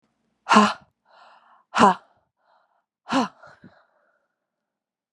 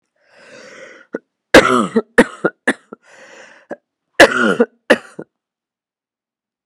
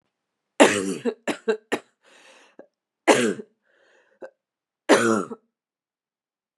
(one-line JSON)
{"exhalation_length": "5.1 s", "exhalation_amplitude": 32173, "exhalation_signal_mean_std_ratio": 0.26, "cough_length": "6.7 s", "cough_amplitude": 32768, "cough_signal_mean_std_ratio": 0.3, "three_cough_length": "6.6 s", "three_cough_amplitude": 32500, "three_cough_signal_mean_std_ratio": 0.32, "survey_phase": "beta (2021-08-13 to 2022-03-07)", "age": "18-44", "gender": "Female", "wearing_mask": "No", "symptom_cough_any": true, "symptom_new_continuous_cough": true, "symptom_runny_or_blocked_nose": true, "symptom_headache": true, "smoker_status": "Never smoked", "respiratory_condition_asthma": false, "respiratory_condition_other": false, "recruitment_source": "Test and Trace", "submission_delay": "2 days", "covid_test_result": "Positive", "covid_test_method": "RT-qPCR", "covid_ct_value": 33.5, "covid_ct_gene": "N gene"}